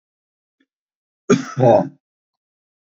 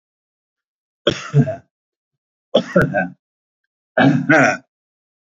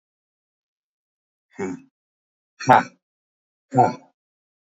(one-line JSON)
{"cough_length": "2.8 s", "cough_amplitude": 26960, "cough_signal_mean_std_ratio": 0.3, "three_cough_length": "5.4 s", "three_cough_amplitude": 28533, "three_cough_signal_mean_std_ratio": 0.38, "exhalation_length": "4.8 s", "exhalation_amplitude": 29408, "exhalation_signal_mean_std_ratio": 0.22, "survey_phase": "beta (2021-08-13 to 2022-03-07)", "age": "65+", "gender": "Male", "wearing_mask": "No", "symptom_none": true, "smoker_status": "Ex-smoker", "respiratory_condition_asthma": false, "respiratory_condition_other": false, "recruitment_source": "REACT", "submission_delay": "2 days", "covid_test_result": "Negative", "covid_test_method": "RT-qPCR", "influenza_a_test_result": "Negative", "influenza_b_test_result": "Negative"}